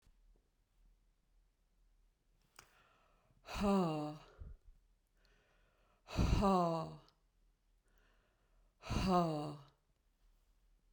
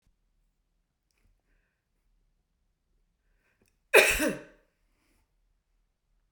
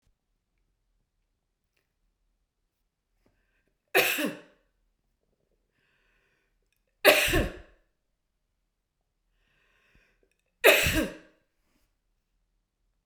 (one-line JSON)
{"exhalation_length": "10.9 s", "exhalation_amplitude": 2884, "exhalation_signal_mean_std_ratio": 0.37, "cough_length": "6.3 s", "cough_amplitude": 20631, "cough_signal_mean_std_ratio": 0.18, "three_cough_length": "13.1 s", "three_cough_amplitude": 29760, "three_cough_signal_mean_std_ratio": 0.23, "survey_phase": "beta (2021-08-13 to 2022-03-07)", "age": "45-64", "gender": "Female", "wearing_mask": "No", "symptom_none": true, "symptom_onset": "5 days", "smoker_status": "Never smoked", "respiratory_condition_asthma": false, "respiratory_condition_other": false, "recruitment_source": "REACT", "submission_delay": "1 day", "covid_test_result": "Negative", "covid_test_method": "RT-qPCR"}